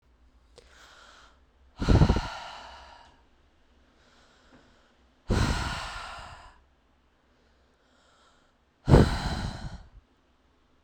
{"exhalation_length": "10.8 s", "exhalation_amplitude": 21787, "exhalation_signal_mean_std_ratio": 0.3, "survey_phase": "beta (2021-08-13 to 2022-03-07)", "age": "18-44", "gender": "Female", "wearing_mask": "No", "symptom_runny_or_blocked_nose": true, "symptom_fatigue": true, "symptom_headache": true, "symptom_change_to_sense_of_smell_or_taste": true, "symptom_loss_of_taste": true, "smoker_status": "Current smoker (11 or more cigarettes per day)", "respiratory_condition_asthma": false, "respiratory_condition_other": false, "recruitment_source": "Test and Trace", "submission_delay": "3 days", "covid_test_result": "Positive", "covid_test_method": "RT-qPCR", "covid_ct_value": 28.9, "covid_ct_gene": "ORF1ab gene"}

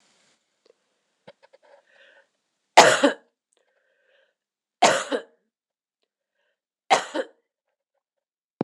{"three_cough_length": "8.6 s", "three_cough_amplitude": 26028, "three_cough_signal_mean_std_ratio": 0.21, "survey_phase": "beta (2021-08-13 to 2022-03-07)", "age": "45-64", "gender": "Female", "wearing_mask": "No", "symptom_none": true, "smoker_status": "Never smoked", "respiratory_condition_asthma": false, "respiratory_condition_other": false, "recruitment_source": "REACT", "submission_delay": "1 day", "covid_test_result": "Negative", "covid_test_method": "RT-qPCR"}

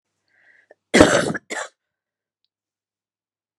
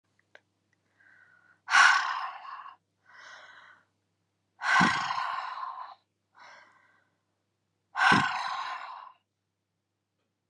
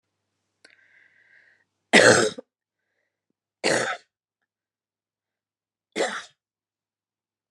{"cough_length": "3.6 s", "cough_amplitude": 32768, "cough_signal_mean_std_ratio": 0.25, "exhalation_length": "10.5 s", "exhalation_amplitude": 14544, "exhalation_signal_mean_std_ratio": 0.36, "three_cough_length": "7.5 s", "three_cough_amplitude": 29683, "three_cough_signal_mean_std_ratio": 0.24, "survey_phase": "beta (2021-08-13 to 2022-03-07)", "age": "45-64", "gender": "Female", "wearing_mask": "No", "symptom_none": true, "smoker_status": "Never smoked", "respiratory_condition_asthma": false, "respiratory_condition_other": false, "recruitment_source": "REACT", "submission_delay": "1 day", "covid_test_result": "Negative", "covid_test_method": "RT-qPCR", "influenza_a_test_result": "Unknown/Void", "influenza_b_test_result": "Unknown/Void"}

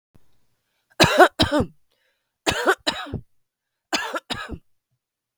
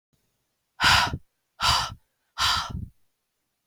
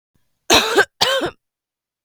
{"three_cough_length": "5.4 s", "three_cough_amplitude": 32766, "three_cough_signal_mean_std_ratio": 0.33, "exhalation_length": "3.7 s", "exhalation_amplitude": 17603, "exhalation_signal_mean_std_ratio": 0.41, "cough_length": "2.0 s", "cough_amplitude": 32768, "cough_signal_mean_std_ratio": 0.42, "survey_phase": "beta (2021-08-13 to 2022-03-07)", "age": "18-44", "gender": "Female", "wearing_mask": "No", "symptom_cough_any": true, "symptom_onset": "6 days", "smoker_status": "Never smoked", "respiratory_condition_asthma": true, "respiratory_condition_other": false, "recruitment_source": "REACT", "submission_delay": "1 day", "covid_test_result": "Negative", "covid_test_method": "RT-qPCR", "influenza_a_test_result": "Negative", "influenza_b_test_result": "Negative"}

